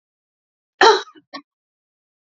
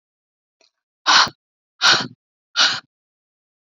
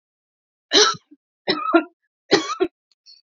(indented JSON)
{
  "cough_length": "2.2 s",
  "cough_amplitude": 29812,
  "cough_signal_mean_std_ratio": 0.24,
  "exhalation_length": "3.7 s",
  "exhalation_amplitude": 29131,
  "exhalation_signal_mean_std_ratio": 0.32,
  "three_cough_length": "3.3 s",
  "three_cough_amplitude": 30419,
  "three_cough_signal_mean_std_ratio": 0.36,
  "survey_phase": "beta (2021-08-13 to 2022-03-07)",
  "age": "18-44",
  "gender": "Female",
  "wearing_mask": "No",
  "symptom_none": true,
  "smoker_status": "Ex-smoker",
  "respiratory_condition_asthma": false,
  "respiratory_condition_other": false,
  "recruitment_source": "REACT",
  "submission_delay": "3 days",
  "covid_test_result": "Negative",
  "covid_test_method": "RT-qPCR",
  "influenza_a_test_result": "Negative",
  "influenza_b_test_result": "Negative"
}